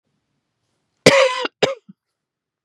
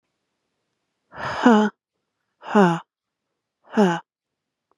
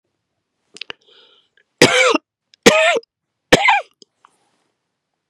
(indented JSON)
{
  "cough_length": "2.6 s",
  "cough_amplitude": 32768,
  "cough_signal_mean_std_ratio": 0.3,
  "exhalation_length": "4.8 s",
  "exhalation_amplitude": 26979,
  "exhalation_signal_mean_std_ratio": 0.33,
  "three_cough_length": "5.3 s",
  "three_cough_amplitude": 32768,
  "three_cough_signal_mean_std_ratio": 0.33,
  "survey_phase": "beta (2021-08-13 to 2022-03-07)",
  "age": "45-64",
  "gender": "Female",
  "wearing_mask": "No",
  "symptom_none": true,
  "smoker_status": "Never smoked",
  "respiratory_condition_asthma": false,
  "respiratory_condition_other": false,
  "recruitment_source": "REACT",
  "submission_delay": "2 days",
  "covid_test_result": "Negative",
  "covid_test_method": "RT-qPCR",
  "influenza_a_test_result": "Unknown/Void",
  "influenza_b_test_result": "Unknown/Void"
}